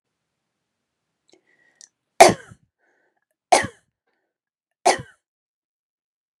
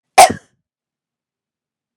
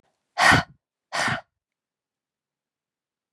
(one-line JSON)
{"three_cough_length": "6.4 s", "three_cough_amplitude": 32768, "three_cough_signal_mean_std_ratio": 0.17, "cough_length": "2.0 s", "cough_amplitude": 32768, "cough_signal_mean_std_ratio": 0.2, "exhalation_length": "3.3 s", "exhalation_amplitude": 25925, "exhalation_signal_mean_std_ratio": 0.28, "survey_phase": "beta (2021-08-13 to 2022-03-07)", "age": "45-64", "gender": "Female", "wearing_mask": "No", "symptom_none": true, "smoker_status": "Ex-smoker", "respiratory_condition_asthma": false, "respiratory_condition_other": false, "recruitment_source": "REACT", "submission_delay": "2 days", "covid_test_result": "Negative", "covid_test_method": "RT-qPCR", "influenza_a_test_result": "Negative", "influenza_b_test_result": "Negative"}